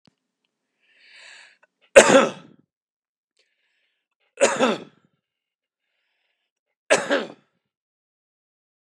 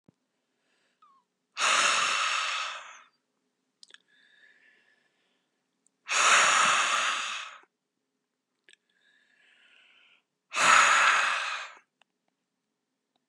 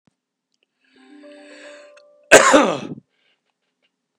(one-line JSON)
{"three_cough_length": "8.9 s", "three_cough_amplitude": 32768, "three_cough_signal_mean_std_ratio": 0.22, "exhalation_length": "13.3 s", "exhalation_amplitude": 17237, "exhalation_signal_mean_std_ratio": 0.41, "cough_length": "4.2 s", "cough_amplitude": 32768, "cough_signal_mean_std_ratio": 0.26, "survey_phase": "beta (2021-08-13 to 2022-03-07)", "age": "45-64", "gender": "Male", "wearing_mask": "No", "symptom_runny_or_blocked_nose": true, "smoker_status": "Ex-smoker", "respiratory_condition_asthma": true, "respiratory_condition_other": false, "recruitment_source": "REACT", "submission_delay": "0 days", "covid_test_result": "Negative", "covid_test_method": "RT-qPCR", "influenza_a_test_result": "Negative", "influenza_b_test_result": "Negative"}